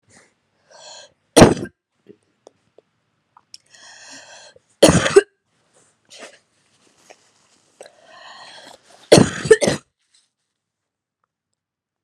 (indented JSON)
{
  "three_cough_length": "12.0 s",
  "three_cough_amplitude": 32768,
  "three_cough_signal_mean_std_ratio": 0.21,
  "survey_phase": "beta (2021-08-13 to 2022-03-07)",
  "age": "18-44",
  "gender": "Female",
  "wearing_mask": "No",
  "symptom_cough_any": true,
  "symptom_runny_or_blocked_nose": true,
  "symptom_shortness_of_breath": true,
  "symptom_abdominal_pain": true,
  "symptom_fatigue": true,
  "symptom_fever_high_temperature": true,
  "symptom_headache": true,
  "symptom_other": true,
  "smoker_status": "Ex-smoker",
  "respiratory_condition_asthma": true,
  "respiratory_condition_other": false,
  "recruitment_source": "Test and Trace",
  "submission_delay": "2 days",
  "covid_test_result": "Positive",
  "covid_test_method": "LFT"
}